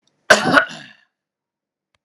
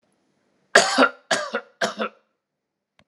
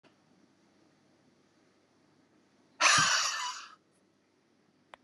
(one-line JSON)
{"cough_length": "2.0 s", "cough_amplitude": 32768, "cough_signal_mean_std_ratio": 0.3, "three_cough_length": "3.1 s", "three_cough_amplitude": 32768, "three_cough_signal_mean_std_ratio": 0.34, "exhalation_length": "5.0 s", "exhalation_amplitude": 9956, "exhalation_signal_mean_std_ratio": 0.3, "survey_phase": "alpha (2021-03-01 to 2021-08-12)", "age": "18-44", "gender": "Male", "wearing_mask": "No", "symptom_none": true, "smoker_status": "Ex-smoker", "respiratory_condition_asthma": false, "respiratory_condition_other": false, "recruitment_source": "REACT", "submission_delay": "3 days", "covid_test_result": "Negative", "covid_test_method": "RT-qPCR"}